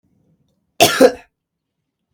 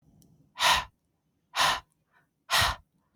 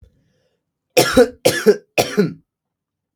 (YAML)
cough_length: 2.1 s
cough_amplitude: 32768
cough_signal_mean_std_ratio: 0.27
exhalation_length: 3.2 s
exhalation_amplitude: 10894
exhalation_signal_mean_std_ratio: 0.39
three_cough_length: 3.2 s
three_cough_amplitude: 32768
three_cough_signal_mean_std_ratio: 0.37
survey_phase: beta (2021-08-13 to 2022-03-07)
age: 18-44
gender: Male
wearing_mask: 'No'
symptom_runny_or_blocked_nose: true
symptom_headache: true
smoker_status: Current smoker (1 to 10 cigarettes per day)
respiratory_condition_asthma: false
respiratory_condition_other: false
recruitment_source: Test and Trace
submission_delay: 1 day
covid_test_result: Negative
covid_test_method: RT-qPCR